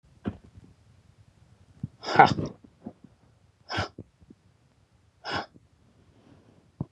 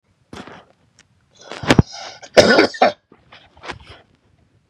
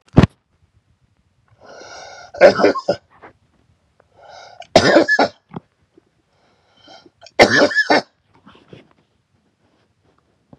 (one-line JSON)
{"exhalation_length": "6.9 s", "exhalation_amplitude": 31483, "exhalation_signal_mean_std_ratio": 0.22, "cough_length": "4.7 s", "cough_amplitude": 32768, "cough_signal_mean_std_ratio": 0.29, "three_cough_length": "10.6 s", "three_cough_amplitude": 32768, "three_cough_signal_mean_std_ratio": 0.3, "survey_phase": "beta (2021-08-13 to 2022-03-07)", "age": "65+", "gender": "Male", "wearing_mask": "No", "symptom_shortness_of_breath": true, "smoker_status": "Ex-smoker", "respiratory_condition_asthma": true, "respiratory_condition_other": false, "recruitment_source": "REACT", "submission_delay": "10 days", "covid_test_result": "Negative", "covid_test_method": "RT-qPCR", "influenza_a_test_result": "Unknown/Void", "influenza_b_test_result": "Unknown/Void"}